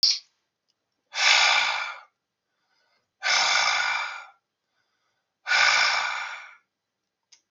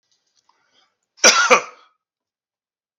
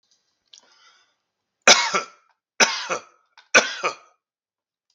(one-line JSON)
{"exhalation_length": "7.5 s", "exhalation_amplitude": 21112, "exhalation_signal_mean_std_ratio": 0.49, "cough_length": "3.0 s", "cough_amplitude": 32768, "cough_signal_mean_std_ratio": 0.27, "three_cough_length": "4.9 s", "three_cough_amplitude": 32768, "three_cough_signal_mean_std_ratio": 0.28, "survey_phase": "beta (2021-08-13 to 2022-03-07)", "age": "45-64", "gender": "Male", "wearing_mask": "No", "symptom_none": true, "smoker_status": "Current smoker (11 or more cigarettes per day)", "respiratory_condition_asthma": false, "respiratory_condition_other": false, "recruitment_source": "REACT", "submission_delay": "4 days", "covid_test_result": "Negative", "covid_test_method": "RT-qPCR"}